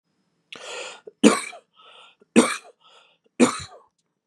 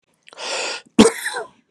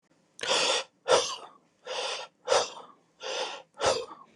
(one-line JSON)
{"three_cough_length": "4.3 s", "three_cough_amplitude": 31701, "three_cough_signal_mean_std_ratio": 0.27, "cough_length": "1.7 s", "cough_amplitude": 32768, "cough_signal_mean_std_ratio": 0.37, "exhalation_length": "4.4 s", "exhalation_amplitude": 12399, "exhalation_signal_mean_std_ratio": 0.51, "survey_phase": "beta (2021-08-13 to 2022-03-07)", "age": "18-44", "gender": "Male", "wearing_mask": "No", "symptom_none": true, "symptom_onset": "12 days", "smoker_status": "Ex-smoker", "respiratory_condition_asthma": false, "respiratory_condition_other": false, "recruitment_source": "REACT", "submission_delay": "2 days", "covid_test_result": "Negative", "covid_test_method": "RT-qPCR"}